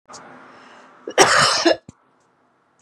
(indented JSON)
{
  "cough_length": "2.8 s",
  "cough_amplitude": 32767,
  "cough_signal_mean_std_ratio": 0.38,
  "survey_phase": "beta (2021-08-13 to 2022-03-07)",
  "age": "45-64",
  "gender": "Female",
  "wearing_mask": "No",
  "symptom_none": true,
  "smoker_status": "Never smoked",
  "respiratory_condition_asthma": false,
  "respiratory_condition_other": false,
  "recruitment_source": "REACT",
  "submission_delay": "1 day",
  "covid_test_result": "Negative",
  "covid_test_method": "RT-qPCR"
}